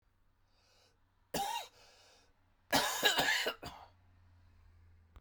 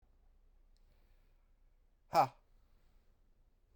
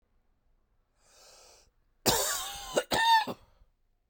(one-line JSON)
{"three_cough_length": "5.2 s", "three_cough_amplitude": 6363, "three_cough_signal_mean_std_ratio": 0.39, "exhalation_length": "3.8 s", "exhalation_amplitude": 5169, "exhalation_signal_mean_std_ratio": 0.19, "cough_length": "4.1 s", "cough_amplitude": 12495, "cough_signal_mean_std_ratio": 0.39, "survey_phase": "beta (2021-08-13 to 2022-03-07)", "age": "45-64", "gender": "Male", "wearing_mask": "No", "symptom_cough_any": true, "symptom_new_continuous_cough": true, "symptom_runny_or_blocked_nose": true, "symptom_shortness_of_breath": true, "symptom_fatigue": true, "symptom_fever_high_temperature": true, "symptom_headache": true, "symptom_onset": "2 days", "smoker_status": "Never smoked", "respiratory_condition_asthma": false, "respiratory_condition_other": false, "recruitment_source": "Test and Trace", "submission_delay": "1 day", "covid_test_result": "Positive", "covid_test_method": "RT-qPCR", "covid_ct_value": 13.2, "covid_ct_gene": "N gene", "covid_ct_mean": 13.8, "covid_viral_load": "30000000 copies/ml", "covid_viral_load_category": "High viral load (>1M copies/ml)"}